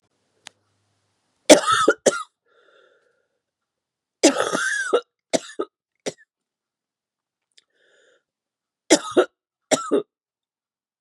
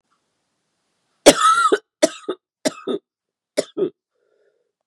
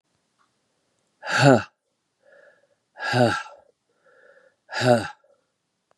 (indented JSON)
{
  "three_cough_length": "11.0 s",
  "three_cough_amplitude": 32768,
  "three_cough_signal_mean_std_ratio": 0.27,
  "cough_length": "4.9 s",
  "cough_amplitude": 32768,
  "cough_signal_mean_std_ratio": 0.31,
  "exhalation_length": "6.0 s",
  "exhalation_amplitude": 25244,
  "exhalation_signal_mean_std_ratio": 0.3,
  "survey_phase": "beta (2021-08-13 to 2022-03-07)",
  "age": "45-64",
  "gender": "Female",
  "wearing_mask": "No",
  "symptom_cough_any": true,
  "symptom_runny_or_blocked_nose": true,
  "symptom_sore_throat": true,
  "symptom_fatigue": true,
  "symptom_onset": "2 days",
  "smoker_status": "Never smoked",
  "respiratory_condition_asthma": false,
  "respiratory_condition_other": false,
  "recruitment_source": "Test and Trace",
  "submission_delay": "1 day",
  "covid_test_result": "Positive",
  "covid_test_method": "RT-qPCR",
  "covid_ct_value": 16.6,
  "covid_ct_gene": "N gene"
}